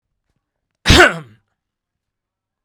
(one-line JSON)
{"cough_length": "2.6 s", "cough_amplitude": 32768, "cough_signal_mean_std_ratio": 0.25, "survey_phase": "beta (2021-08-13 to 2022-03-07)", "age": "45-64", "gender": "Male", "wearing_mask": "No", "symptom_none": true, "smoker_status": "Never smoked", "respiratory_condition_asthma": false, "respiratory_condition_other": false, "recruitment_source": "REACT", "submission_delay": "1 day", "covid_test_result": "Negative", "covid_test_method": "RT-qPCR"}